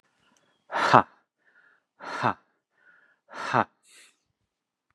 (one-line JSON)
{"exhalation_length": "4.9 s", "exhalation_amplitude": 32746, "exhalation_signal_mean_std_ratio": 0.23, "survey_phase": "beta (2021-08-13 to 2022-03-07)", "age": "45-64", "gender": "Male", "wearing_mask": "No", "symptom_none": true, "smoker_status": "Never smoked", "respiratory_condition_asthma": false, "respiratory_condition_other": false, "recruitment_source": "REACT", "submission_delay": "3 days", "covid_test_result": "Negative", "covid_test_method": "RT-qPCR", "influenza_a_test_result": "Negative", "influenza_b_test_result": "Negative"}